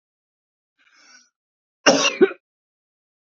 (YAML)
cough_length: 3.3 s
cough_amplitude: 28418
cough_signal_mean_std_ratio: 0.24
survey_phase: beta (2021-08-13 to 2022-03-07)
age: 18-44
gender: Male
wearing_mask: 'No'
symptom_none: true
smoker_status: Never smoked
respiratory_condition_asthma: false
respiratory_condition_other: false
recruitment_source: REACT
submission_delay: 1 day
covid_test_result: Negative
covid_test_method: RT-qPCR